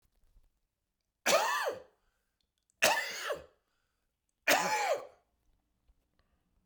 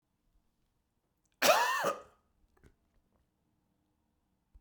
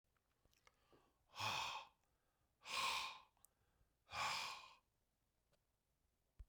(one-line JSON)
{"three_cough_length": "6.7 s", "three_cough_amplitude": 8249, "three_cough_signal_mean_std_ratio": 0.37, "cough_length": "4.6 s", "cough_amplitude": 10136, "cough_signal_mean_std_ratio": 0.26, "exhalation_length": "6.5 s", "exhalation_amplitude": 1024, "exhalation_signal_mean_std_ratio": 0.4, "survey_phase": "beta (2021-08-13 to 2022-03-07)", "age": "45-64", "gender": "Male", "wearing_mask": "No", "symptom_runny_or_blocked_nose": true, "symptom_sore_throat": true, "symptom_fatigue": true, "smoker_status": "Current smoker (e-cigarettes or vapes only)", "respiratory_condition_asthma": false, "respiratory_condition_other": false, "recruitment_source": "Test and Trace", "submission_delay": "1 day", "covid_test_result": "Positive", "covid_test_method": "LFT"}